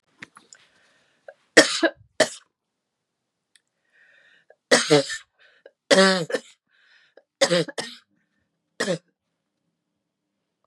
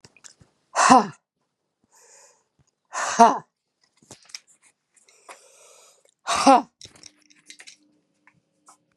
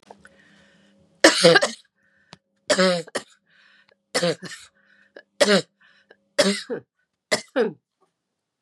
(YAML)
three_cough_length: 10.7 s
three_cough_amplitude: 32768
three_cough_signal_mean_std_ratio: 0.27
exhalation_length: 9.0 s
exhalation_amplitude: 32558
exhalation_signal_mean_std_ratio: 0.24
cough_length: 8.6 s
cough_amplitude: 32767
cough_signal_mean_std_ratio: 0.33
survey_phase: beta (2021-08-13 to 2022-03-07)
age: 65+
gender: Female
wearing_mask: 'No'
symptom_cough_any: true
symptom_runny_or_blocked_nose: true
smoker_status: Ex-smoker
respiratory_condition_asthma: false
respiratory_condition_other: false
recruitment_source: Test and Trace
submission_delay: 2 days
covid_test_result: Positive
covid_test_method: ePCR